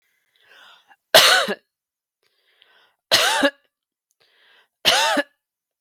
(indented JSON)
{
  "three_cough_length": "5.8 s",
  "three_cough_amplitude": 32768,
  "three_cough_signal_mean_std_ratio": 0.34,
  "survey_phase": "beta (2021-08-13 to 2022-03-07)",
  "age": "18-44",
  "gender": "Female",
  "wearing_mask": "No",
  "symptom_fatigue": true,
  "symptom_headache": true,
  "symptom_other": true,
  "smoker_status": "Never smoked",
  "respiratory_condition_asthma": false,
  "respiratory_condition_other": false,
  "recruitment_source": "Test and Trace",
  "submission_delay": "1 day",
  "covid_test_result": "Negative",
  "covid_test_method": "RT-qPCR"
}